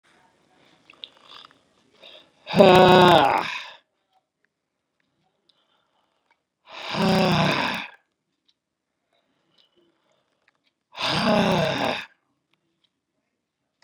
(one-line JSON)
{"exhalation_length": "13.8 s", "exhalation_amplitude": 32147, "exhalation_signal_mean_std_ratio": 0.32, "survey_phase": "beta (2021-08-13 to 2022-03-07)", "age": "65+", "gender": "Male", "wearing_mask": "No", "symptom_none": true, "smoker_status": "Never smoked", "respiratory_condition_asthma": false, "respiratory_condition_other": false, "recruitment_source": "REACT", "submission_delay": "2 days", "covid_test_result": "Negative", "covid_test_method": "RT-qPCR", "influenza_a_test_result": "Unknown/Void", "influenza_b_test_result": "Unknown/Void"}